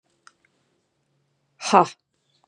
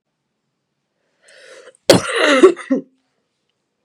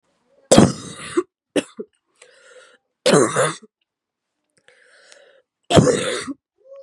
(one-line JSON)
{"exhalation_length": "2.5 s", "exhalation_amplitude": 29253, "exhalation_signal_mean_std_ratio": 0.18, "cough_length": "3.8 s", "cough_amplitude": 32768, "cough_signal_mean_std_ratio": 0.32, "three_cough_length": "6.8 s", "three_cough_amplitude": 32768, "three_cough_signal_mean_std_ratio": 0.33, "survey_phase": "beta (2021-08-13 to 2022-03-07)", "age": "18-44", "gender": "Female", "wearing_mask": "No", "symptom_cough_any": true, "symptom_runny_or_blocked_nose": true, "symptom_sore_throat": true, "symptom_fatigue": true, "symptom_change_to_sense_of_smell_or_taste": true, "symptom_loss_of_taste": true, "smoker_status": "Prefer not to say", "respiratory_condition_asthma": false, "respiratory_condition_other": false, "recruitment_source": "Test and Trace", "submission_delay": "1 day", "covid_test_result": "Positive", "covid_test_method": "RT-qPCR", "covid_ct_value": 25.0, "covid_ct_gene": "ORF1ab gene", "covid_ct_mean": 25.9, "covid_viral_load": "3300 copies/ml", "covid_viral_load_category": "Minimal viral load (< 10K copies/ml)"}